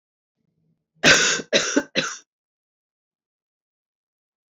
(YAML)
cough_length: 4.5 s
cough_amplitude: 27453
cough_signal_mean_std_ratio: 0.3
survey_phase: beta (2021-08-13 to 2022-03-07)
age: 45-64
gender: Female
wearing_mask: 'No'
symptom_cough_any: true
symptom_new_continuous_cough: true
symptom_runny_or_blocked_nose: true
symptom_sore_throat: true
symptom_fatigue: true
symptom_headache: true
symptom_other: true
symptom_onset: 3 days
smoker_status: Never smoked
respiratory_condition_asthma: false
respiratory_condition_other: false
recruitment_source: Test and Trace
submission_delay: 2 days
covid_test_result: Positive
covid_test_method: RT-qPCR
covid_ct_value: 16.6
covid_ct_gene: ORF1ab gene
covid_ct_mean: 17.1
covid_viral_load: 2500000 copies/ml
covid_viral_load_category: High viral load (>1M copies/ml)